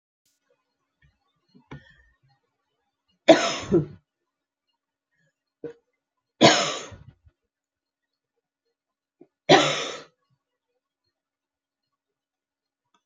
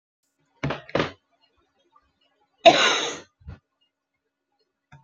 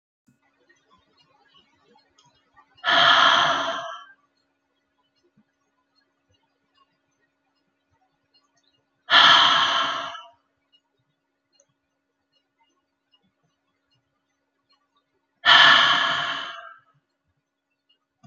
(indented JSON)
{
  "three_cough_length": "13.1 s",
  "three_cough_amplitude": 27948,
  "three_cough_signal_mean_std_ratio": 0.21,
  "cough_length": "5.0 s",
  "cough_amplitude": 28234,
  "cough_signal_mean_std_ratio": 0.25,
  "exhalation_length": "18.3 s",
  "exhalation_amplitude": 27649,
  "exhalation_signal_mean_std_ratio": 0.3,
  "survey_phase": "beta (2021-08-13 to 2022-03-07)",
  "age": "65+",
  "gender": "Female",
  "wearing_mask": "No",
  "symptom_cough_any": true,
  "symptom_sore_throat": true,
  "symptom_change_to_sense_of_smell_or_taste": true,
  "symptom_loss_of_taste": true,
  "symptom_onset": "8 days",
  "smoker_status": "Never smoked",
  "respiratory_condition_asthma": false,
  "respiratory_condition_other": false,
  "recruitment_source": "Test and Trace",
  "submission_delay": "2 days",
  "covid_test_result": "Positive",
  "covid_test_method": "RT-qPCR"
}